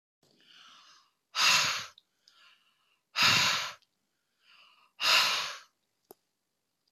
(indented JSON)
{
  "exhalation_length": "6.9 s",
  "exhalation_amplitude": 9052,
  "exhalation_signal_mean_std_ratio": 0.38,
  "survey_phase": "beta (2021-08-13 to 2022-03-07)",
  "age": "65+",
  "gender": "Female",
  "wearing_mask": "No",
  "symptom_none": true,
  "smoker_status": "Ex-smoker",
  "respiratory_condition_asthma": false,
  "respiratory_condition_other": false,
  "recruitment_source": "REACT",
  "submission_delay": "1 day",
  "covid_test_result": "Negative",
  "covid_test_method": "RT-qPCR"
}